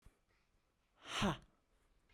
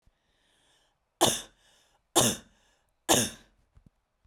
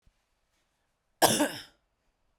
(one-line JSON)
{"exhalation_length": "2.1 s", "exhalation_amplitude": 2150, "exhalation_signal_mean_std_ratio": 0.3, "three_cough_length": "4.3 s", "three_cough_amplitude": 14498, "three_cough_signal_mean_std_ratio": 0.28, "cough_length": "2.4 s", "cough_amplitude": 21229, "cough_signal_mean_std_ratio": 0.26, "survey_phase": "beta (2021-08-13 to 2022-03-07)", "age": "18-44", "gender": "Female", "wearing_mask": "No", "symptom_runny_or_blocked_nose": true, "smoker_status": "Ex-smoker", "respiratory_condition_asthma": false, "respiratory_condition_other": false, "recruitment_source": "REACT", "submission_delay": "1 day", "covid_test_result": "Negative", "covid_test_method": "RT-qPCR"}